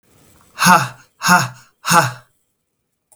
{"exhalation_length": "3.2 s", "exhalation_amplitude": 32768, "exhalation_signal_mean_std_ratio": 0.39, "survey_phase": "beta (2021-08-13 to 2022-03-07)", "age": "18-44", "gender": "Male", "wearing_mask": "No", "symptom_none": true, "smoker_status": "Never smoked", "respiratory_condition_asthma": true, "respiratory_condition_other": false, "recruitment_source": "REACT", "submission_delay": "12 days", "covid_test_result": "Negative", "covid_test_method": "RT-qPCR", "influenza_a_test_result": "Negative", "influenza_b_test_result": "Negative"}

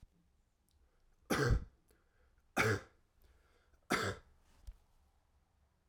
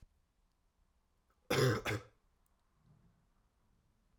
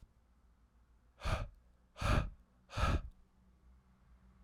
{"three_cough_length": "5.9 s", "three_cough_amplitude": 3718, "three_cough_signal_mean_std_ratio": 0.32, "cough_length": "4.2 s", "cough_amplitude": 3771, "cough_signal_mean_std_ratio": 0.27, "exhalation_length": "4.4 s", "exhalation_amplitude": 3148, "exhalation_signal_mean_std_ratio": 0.38, "survey_phase": "alpha (2021-03-01 to 2021-08-12)", "age": "18-44", "gender": "Male", "wearing_mask": "No", "symptom_headache": true, "smoker_status": "Current smoker (1 to 10 cigarettes per day)", "respiratory_condition_asthma": false, "respiratory_condition_other": false, "recruitment_source": "Test and Trace", "submission_delay": "2 days", "covid_test_result": "Positive", "covid_test_method": "LFT"}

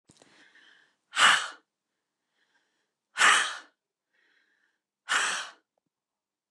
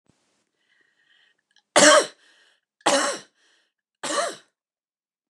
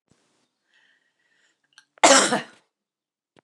{"exhalation_length": "6.5 s", "exhalation_amplitude": 15937, "exhalation_signal_mean_std_ratio": 0.29, "three_cough_length": "5.3 s", "three_cough_amplitude": 28720, "three_cough_signal_mean_std_ratio": 0.28, "cough_length": "3.4 s", "cough_amplitude": 29203, "cough_signal_mean_std_ratio": 0.24, "survey_phase": "alpha (2021-03-01 to 2021-08-12)", "age": "65+", "gender": "Female", "wearing_mask": "No", "symptom_none": true, "smoker_status": "Never smoked", "respiratory_condition_asthma": false, "respiratory_condition_other": false, "recruitment_source": "REACT", "submission_delay": "1 day", "covid_test_result": "Negative", "covid_test_method": "RT-qPCR"}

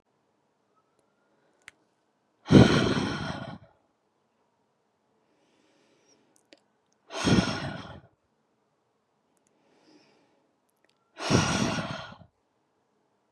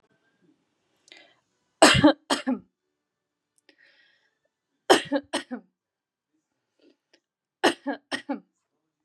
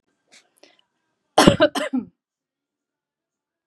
{"exhalation_length": "13.3 s", "exhalation_amplitude": 23073, "exhalation_signal_mean_std_ratio": 0.27, "three_cough_length": "9.0 s", "three_cough_amplitude": 29802, "three_cough_signal_mean_std_ratio": 0.24, "cough_length": "3.7 s", "cough_amplitude": 32768, "cough_signal_mean_std_ratio": 0.24, "survey_phase": "beta (2021-08-13 to 2022-03-07)", "age": "18-44", "gender": "Female", "wearing_mask": "No", "symptom_none": true, "smoker_status": "Never smoked", "respiratory_condition_asthma": false, "respiratory_condition_other": false, "recruitment_source": "REACT", "submission_delay": "2 days", "covid_test_result": "Negative", "covid_test_method": "RT-qPCR"}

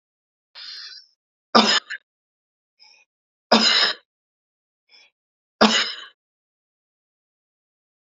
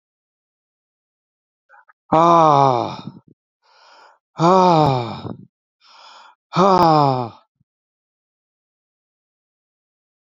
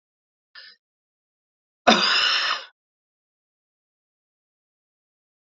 {"three_cough_length": "8.1 s", "three_cough_amplitude": 32767, "three_cough_signal_mean_std_ratio": 0.27, "exhalation_length": "10.2 s", "exhalation_amplitude": 29716, "exhalation_signal_mean_std_ratio": 0.34, "cough_length": "5.5 s", "cough_amplitude": 27138, "cough_signal_mean_std_ratio": 0.27, "survey_phase": "beta (2021-08-13 to 2022-03-07)", "age": "65+", "gender": "Male", "wearing_mask": "No", "symptom_none": true, "smoker_status": "Ex-smoker", "respiratory_condition_asthma": false, "respiratory_condition_other": true, "recruitment_source": "REACT", "submission_delay": "3 days", "covid_test_result": "Negative", "covid_test_method": "RT-qPCR"}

